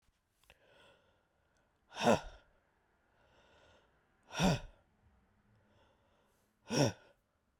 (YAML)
exhalation_length: 7.6 s
exhalation_amplitude: 5048
exhalation_signal_mean_std_ratio: 0.25
survey_phase: beta (2021-08-13 to 2022-03-07)
age: 45-64
gender: Female
wearing_mask: 'No'
symptom_cough_any: true
symptom_runny_or_blocked_nose: true
symptom_shortness_of_breath: true
symptom_fatigue: true
symptom_loss_of_taste: true
symptom_onset: 4 days
smoker_status: Ex-smoker
respiratory_condition_asthma: false
respiratory_condition_other: false
recruitment_source: Test and Trace
submission_delay: 2 days
covid_test_result: Positive
covid_test_method: RT-qPCR
covid_ct_value: 22.2
covid_ct_gene: ORF1ab gene